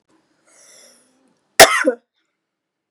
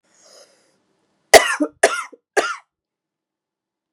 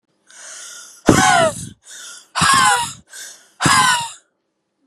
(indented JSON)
{
  "cough_length": "2.9 s",
  "cough_amplitude": 32768,
  "cough_signal_mean_std_ratio": 0.22,
  "three_cough_length": "3.9 s",
  "three_cough_amplitude": 32768,
  "three_cough_signal_mean_std_ratio": 0.24,
  "exhalation_length": "4.9 s",
  "exhalation_amplitude": 32768,
  "exhalation_signal_mean_std_ratio": 0.5,
  "survey_phase": "beta (2021-08-13 to 2022-03-07)",
  "age": "18-44",
  "gender": "Female",
  "wearing_mask": "No",
  "symptom_cough_any": true,
  "symptom_runny_or_blocked_nose": true,
  "symptom_shortness_of_breath": true,
  "symptom_fatigue": true,
  "symptom_fever_high_temperature": true,
  "symptom_headache": true,
  "symptom_onset": "2 days",
  "smoker_status": "Ex-smoker",
  "respiratory_condition_asthma": true,
  "respiratory_condition_other": false,
  "recruitment_source": "Test and Trace",
  "submission_delay": "2 days",
  "covid_test_result": "Positive",
  "covid_test_method": "RT-qPCR",
  "covid_ct_value": 21.6,
  "covid_ct_gene": "ORF1ab gene",
  "covid_ct_mean": 21.8,
  "covid_viral_load": "72000 copies/ml",
  "covid_viral_load_category": "Low viral load (10K-1M copies/ml)"
}